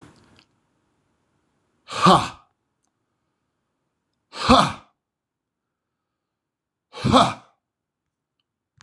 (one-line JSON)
{"exhalation_length": "8.8 s", "exhalation_amplitude": 26027, "exhalation_signal_mean_std_ratio": 0.24, "survey_phase": "beta (2021-08-13 to 2022-03-07)", "age": "45-64", "gender": "Male", "wearing_mask": "No", "symptom_none": true, "smoker_status": "Current smoker (11 or more cigarettes per day)", "respiratory_condition_asthma": false, "respiratory_condition_other": false, "recruitment_source": "REACT", "submission_delay": "1 day", "covid_test_result": "Negative", "covid_test_method": "RT-qPCR"}